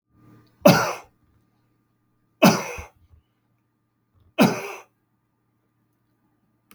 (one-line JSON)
{"three_cough_length": "6.7 s", "three_cough_amplitude": 32766, "three_cough_signal_mean_std_ratio": 0.24, "survey_phase": "beta (2021-08-13 to 2022-03-07)", "age": "65+", "gender": "Male", "wearing_mask": "No", "symptom_cough_any": true, "symptom_runny_or_blocked_nose": true, "symptom_fatigue": true, "symptom_headache": true, "symptom_onset": "4 days", "smoker_status": "Ex-smoker", "respiratory_condition_asthma": false, "respiratory_condition_other": false, "recruitment_source": "Test and Trace", "submission_delay": "1 day", "covid_test_result": "Positive", "covid_test_method": "RT-qPCR"}